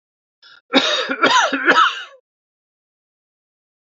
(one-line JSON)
{"cough_length": "3.8 s", "cough_amplitude": 29754, "cough_signal_mean_std_ratio": 0.43, "survey_phase": "beta (2021-08-13 to 2022-03-07)", "age": "65+", "gender": "Male", "wearing_mask": "No", "symptom_other": true, "symptom_onset": "8 days", "smoker_status": "Never smoked", "respiratory_condition_asthma": false, "respiratory_condition_other": false, "recruitment_source": "REACT", "submission_delay": "1 day", "covid_test_result": "Negative", "covid_test_method": "RT-qPCR", "influenza_a_test_result": "Negative", "influenza_b_test_result": "Negative"}